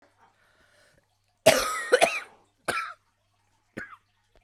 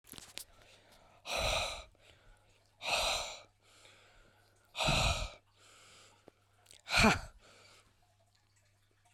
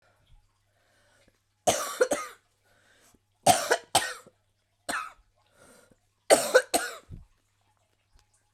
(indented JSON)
{
  "cough_length": "4.4 s",
  "cough_amplitude": 21797,
  "cough_signal_mean_std_ratio": 0.3,
  "exhalation_length": "9.1 s",
  "exhalation_amplitude": 7598,
  "exhalation_signal_mean_std_ratio": 0.37,
  "three_cough_length": "8.5 s",
  "three_cough_amplitude": 18415,
  "three_cough_signal_mean_std_ratio": 0.29,
  "survey_phase": "beta (2021-08-13 to 2022-03-07)",
  "age": "45-64",
  "gender": "Female",
  "wearing_mask": "No",
  "symptom_cough_any": true,
  "symptom_shortness_of_breath": true,
  "symptom_sore_throat": true,
  "symptom_fatigue": true,
  "symptom_fever_high_temperature": true,
  "symptom_headache": true,
  "symptom_other": true,
  "smoker_status": "Never smoked",
  "respiratory_condition_asthma": false,
  "respiratory_condition_other": false,
  "recruitment_source": "Test and Trace",
  "submission_delay": "2 days",
  "covid_test_result": "Positive",
  "covid_test_method": "ePCR"
}